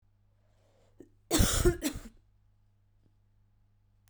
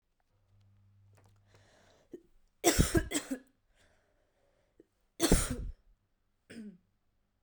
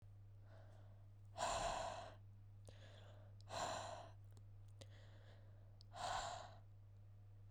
{"cough_length": "4.1 s", "cough_amplitude": 8731, "cough_signal_mean_std_ratio": 0.3, "three_cough_length": "7.4 s", "three_cough_amplitude": 9932, "three_cough_signal_mean_std_ratio": 0.28, "exhalation_length": "7.5 s", "exhalation_amplitude": 932, "exhalation_signal_mean_std_ratio": 0.72, "survey_phase": "beta (2021-08-13 to 2022-03-07)", "age": "18-44", "gender": "Female", "wearing_mask": "No", "symptom_cough_any": true, "symptom_new_continuous_cough": true, "symptom_runny_or_blocked_nose": true, "symptom_sore_throat": true, "symptom_onset": "10 days", "smoker_status": "Never smoked", "respiratory_condition_asthma": true, "respiratory_condition_other": false, "recruitment_source": "Test and Trace", "submission_delay": "2 days", "covid_test_result": "Positive", "covid_test_method": "RT-qPCR", "covid_ct_value": 19.3, "covid_ct_gene": "N gene"}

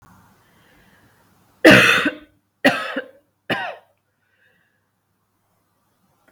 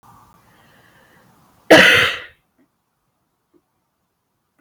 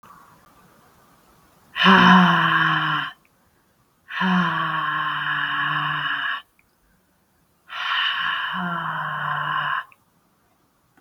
{"three_cough_length": "6.3 s", "three_cough_amplitude": 32768, "three_cough_signal_mean_std_ratio": 0.27, "cough_length": "4.6 s", "cough_amplitude": 32768, "cough_signal_mean_std_ratio": 0.25, "exhalation_length": "11.0 s", "exhalation_amplitude": 31909, "exhalation_signal_mean_std_ratio": 0.56, "survey_phase": "beta (2021-08-13 to 2022-03-07)", "age": "18-44", "gender": "Female", "wearing_mask": "No", "symptom_cough_any": true, "symptom_runny_or_blocked_nose": true, "symptom_sore_throat": true, "symptom_headache": true, "symptom_onset": "4 days", "smoker_status": "Never smoked", "respiratory_condition_asthma": false, "respiratory_condition_other": false, "recruitment_source": "Test and Trace", "submission_delay": "1 day", "covid_test_result": "Positive", "covid_test_method": "RT-qPCR", "covid_ct_value": 24.6, "covid_ct_gene": "ORF1ab gene"}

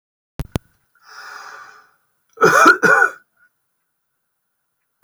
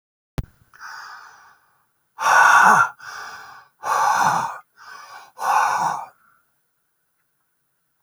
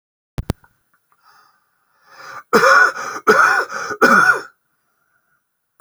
{"cough_length": "5.0 s", "cough_amplitude": 30439, "cough_signal_mean_std_ratio": 0.31, "exhalation_length": "8.0 s", "exhalation_amplitude": 27253, "exhalation_signal_mean_std_ratio": 0.42, "three_cough_length": "5.8 s", "three_cough_amplitude": 29660, "three_cough_signal_mean_std_ratio": 0.41, "survey_phase": "beta (2021-08-13 to 2022-03-07)", "age": "65+", "gender": "Male", "wearing_mask": "No", "symptom_fatigue": true, "smoker_status": "Current smoker (1 to 10 cigarettes per day)", "respiratory_condition_asthma": false, "respiratory_condition_other": false, "recruitment_source": "REACT", "submission_delay": "3 days", "covid_test_result": "Negative", "covid_test_method": "RT-qPCR"}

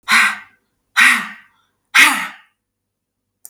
{"exhalation_length": "3.5 s", "exhalation_amplitude": 32768, "exhalation_signal_mean_std_ratio": 0.39, "survey_phase": "beta (2021-08-13 to 2022-03-07)", "age": "65+", "gender": "Female", "wearing_mask": "No", "symptom_none": true, "smoker_status": "Never smoked", "respiratory_condition_asthma": false, "respiratory_condition_other": false, "recruitment_source": "REACT", "submission_delay": "2 days", "covid_test_result": "Negative", "covid_test_method": "RT-qPCR", "influenza_a_test_result": "Negative", "influenza_b_test_result": "Negative"}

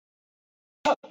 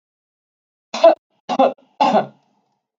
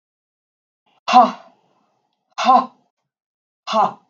{"cough_length": "1.1 s", "cough_amplitude": 8454, "cough_signal_mean_std_ratio": 0.24, "three_cough_length": "3.0 s", "three_cough_amplitude": 32768, "three_cough_signal_mean_std_ratio": 0.34, "exhalation_length": "4.1 s", "exhalation_amplitude": 32768, "exhalation_signal_mean_std_ratio": 0.31, "survey_phase": "beta (2021-08-13 to 2022-03-07)", "age": "18-44", "gender": "Female", "wearing_mask": "No", "symptom_cough_any": true, "symptom_runny_or_blocked_nose": true, "symptom_onset": "11 days", "smoker_status": "Never smoked", "respiratory_condition_asthma": false, "respiratory_condition_other": false, "recruitment_source": "REACT", "submission_delay": "1 day", "covid_test_result": "Negative", "covid_test_method": "RT-qPCR"}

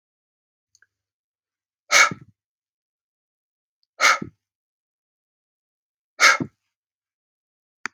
{"exhalation_length": "7.9 s", "exhalation_amplitude": 31581, "exhalation_signal_mean_std_ratio": 0.2, "survey_phase": "beta (2021-08-13 to 2022-03-07)", "age": "18-44", "gender": "Male", "wearing_mask": "No", "symptom_none": true, "smoker_status": "Never smoked", "respiratory_condition_asthma": false, "respiratory_condition_other": false, "recruitment_source": "REACT", "submission_delay": "1 day", "covid_test_result": "Negative", "covid_test_method": "RT-qPCR"}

